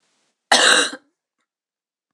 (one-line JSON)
{"cough_length": "2.1 s", "cough_amplitude": 26028, "cough_signal_mean_std_ratio": 0.34, "survey_phase": "beta (2021-08-13 to 2022-03-07)", "age": "45-64", "gender": "Female", "wearing_mask": "No", "symptom_cough_any": true, "symptom_sore_throat": true, "symptom_onset": "3 days", "smoker_status": "Never smoked", "respiratory_condition_asthma": false, "respiratory_condition_other": false, "recruitment_source": "Test and Trace", "submission_delay": "2 days", "covid_test_result": "Positive", "covid_test_method": "RT-qPCR"}